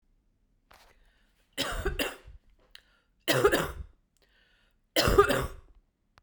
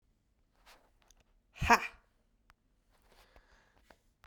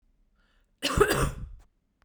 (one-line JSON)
{"three_cough_length": "6.2 s", "three_cough_amplitude": 16396, "three_cough_signal_mean_std_ratio": 0.36, "exhalation_length": "4.3 s", "exhalation_amplitude": 13364, "exhalation_signal_mean_std_ratio": 0.17, "cough_length": "2.0 s", "cough_amplitude": 15761, "cough_signal_mean_std_ratio": 0.4, "survey_phase": "beta (2021-08-13 to 2022-03-07)", "age": "45-64", "gender": "Female", "wearing_mask": "No", "symptom_runny_or_blocked_nose": true, "symptom_abdominal_pain": true, "symptom_headache": true, "symptom_change_to_sense_of_smell_or_taste": true, "symptom_loss_of_taste": true, "symptom_onset": "5 days", "smoker_status": "Ex-smoker", "respiratory_condition_asthma": false, "respiratory_condition_other": false, "recruitment_source": "Test and Trace", "submission_delay": "2 days", "covid_test_result": "Positive", "covid_test_method": "RT-qPCR", "covid_ct_value": 20.3, "covid_ct_gene": "ORF1ab gene"}